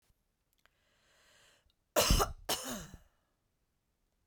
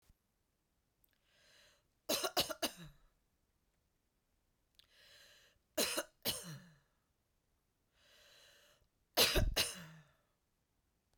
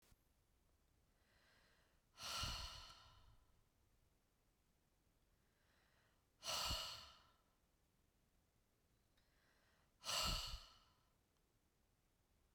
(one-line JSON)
{"cough_length": "4.3 s", "cough_amplitude": 5993, "cough_signal_mean_std_ratio": 0.29, "three_cough_length": "11.2 s", "three_cough_amplitude": 5708, "three_cough_signal_mean_std_ratio": 0.28, "exhalation_length": "12.5 s", "exhalation_amplitude": 909, "exhalation_signal_mean_std_ratio": 0.34, "survey_phase": "beta (2021-08-13 to 2022-03-07)", "age": "45-64", "gender": "Female", "wearing_mask": "No", "symptom_none": true, "smoker_status": "Never smoked", "respiratory_condition_asthma": false, "respiratory_condition_other": false, "recruitment_source": "REACT", "submission_delay": "1 day", "covid_test_result": "Negative", "covid_test_method": "RT-qPCR"}